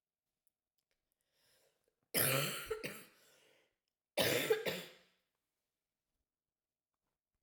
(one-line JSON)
{"cough_length": "7.4 s", "cough_amplitude": 3841, "cough_signal_mean_std_ratio": 0.32, "survey_phase": "beta (2021-08-13 to 2022-03-07)", "age": "45-64", "gender": "Female", "wearing_mask": "No", "symptom_cough_any": true, "symptom_runny_or_blocked_nose": true, "symptom_shortness_of_breath": true, "symptom_fatigue": true, "symptom_fever_high_temperature": true, "symptom_headache": true, "symptom_change_to_sense_of_smell_or_taste": true, "symptom_loss_of_taste": true, "smoker_status": "Never smoked", "respiratory_condition_asthma": true, "respiratory_condition_other": false, "recruitment_source": "Test and Trace", "submission_delay": "2 days", "covid_test_result": "Positive", "covid_test_method": "RT-qPCR"}